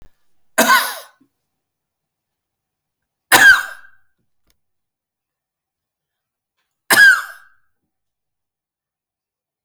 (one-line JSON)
{"cough_length": "9.6 s", "cough_amplitude": 32768, "cough_signal_mean_std_ratio": 0.25, "survey_phase": "alpha (2021-03-01 to 2021-08-12)", "age": "65+", "gender": "Male", "wearing_mask": "No", "symptom_none": true, "smoker_status": "Never smoked", "respiratory_condition_asthma": false, "respiratory_condition_other": false, "recruitment_source": "REACT", "submission_delay": "1 day", "covid_test_result": "Negative", "covid_test_method": "RT-qPCR"}